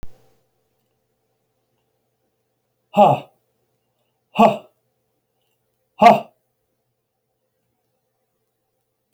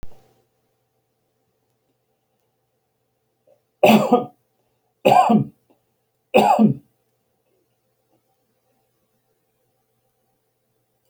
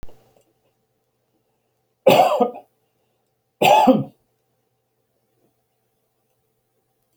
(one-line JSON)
{"exhalation_length": "9.1 s", "exhalation_amplitude": 31818, "exhalation_signal_mean_std_ratio": 0.2, "three_cough_length": "11.1 s", "three_cough_amplitude": 28268, "three_cough_signal_mean_std_ratio": 0.26, "cough_length": "7.2 s", "cough_amplitude": 28083, "cough_signal_mean_std_ratio": 0.27, "survey_phase": "beta (2021-08-13 to 2022-03-07)", "age": "65+", "gender": "Male", "wearing_mask": "No", "symptom_none": true, "smoker_status": "Never smoked", "respiratory_condition_asthma": false, "respiratory_condition_other": false, "recruitment_source": "REACT", "submission_delay": "1 day", "covid_test_result": "Negative", "covid_test_method": "RT-qPCR"}